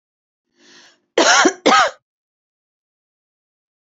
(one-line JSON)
{"cough_length": "3.9 s", "cough_amplitude": 30641, "cough_signal_mean_std_ratio": 0.32, "survey_phase": "beta (2021-08-13 to 2022-03-07)", "age": "45-64", "gender": "Female", "wearing_mask": "No", "symptom_cough_any": true, "symptom_runny_or_blocked_nose": true, "symptom_sore_throat": true, "symptom_fatigue": true, "symptom_onset": "26 days", "smoker_status": "Current smoker (e-cigarettes or vapes only)", "respiratory_condition_asthma": false, "respiratory_condition_other": false, "recruitment_source": "Test and Trace", "submission_delay": "2 days", "covid_test_result": "Negative", "covid_test_method": "RT-qPCR"}